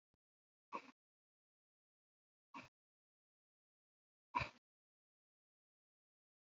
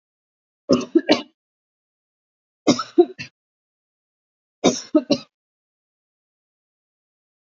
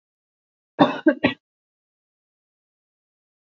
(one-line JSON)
{"exhalation_length": "6.6 s", "exhalation_amplitude": 1627, "exhalation_signal_mean_std_ratio": 0.14, "three_cough_length": "7.6 s", "three_cough_amplitude": 27230, "three_cough_signal_mean_std_ratio": 0.24, "cough_length": "3.5 s", "cough_amplitude": 26144, "cough_signal_mean_std_ratio": 0.21, "survey_phase": "beta (2021-08-13 to 2022-03-07)", "age": "45-64", "gender": "Female", "wearing_mask": "No", "symptom_none": true, "smoker_status": "Never smoked", "respiratory_condition_asthma": false, "respiratory_condition_other": false, "recruitment_source": "REACT", "submission_delay": "2 days", "covid_test_result": "Negative", "covid_test_method": "RT-qPCR", "influenza_a_test_result": "Negative", "influenza_b_test_result": "Negative"}